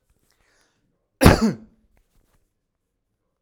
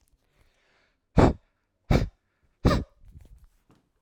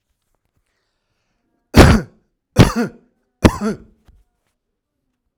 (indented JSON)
{
  "cough_length": "3.4 s",
  "cough_amplitude": 32768,
  "cough_signal_mean_std_ratio": 0.21,
  "exhalation_length": "4.0 s",
  "exhalation_amplitude": 19402,
  "exhalation_signal_mean_std_ratio": 0.27,
  "three_cough_length": "5.4 s",
  "three_cough_amplitude": 32768,
  "three_cough_signal_mean_std_ratio": 0.26,
  "survey_phase": "alpha (2021-03-01 to 2021-08-12)",
  "age": "45-64",
  "gender": "Male",
  "wearing_mask": "No",
  "symptom_none": true,
  "smoker_status": "Ex-smoker",
  "respiratory_condition_asthma": false,
  "respiratory_condition_other": false,
  "recruitment_source": "REACT",
  "submission_delay": "1 day",
  "covid_test_result": "Negative",
  "covid_test_method": "RT-qPCR"
}